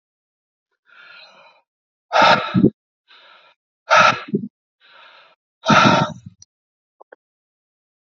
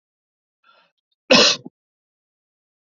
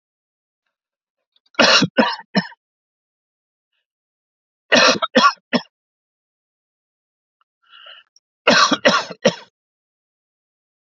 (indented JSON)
{
  "exhalation_length": "8.0 s",
  "exhalation_amplitude": 28815,
  "exhalation_signal_mean_std_ratio": 0.32,
  "cough_length": "3.0 s",
  "cough_amplitude": 30880,
  "cough_signal_mean_std_ratio": 0.23,
  "three_cough_length": "10.9 s",
  "three_cough_amplitude": 30793,
  "three_cough_signal_mean_std_ratio": 0.3,
  "survey_phase": "alpha (2021-03-01 to 2021-08-12)",
  "age": "45-64",
  "gender": "Male",
  "wearing_mask": "No",
  "symptom_none": true,
  "smoker_status": "Ex-smoker",
  "respiratory_condition_asthma": false,
  "respiratory_condition_other": false,
  "recruitment_source": "REACT",
  "submission_delay": "2 days",
  "covid_test_result": "Negative",
  "covid_test_method": "RT-qPCR"
}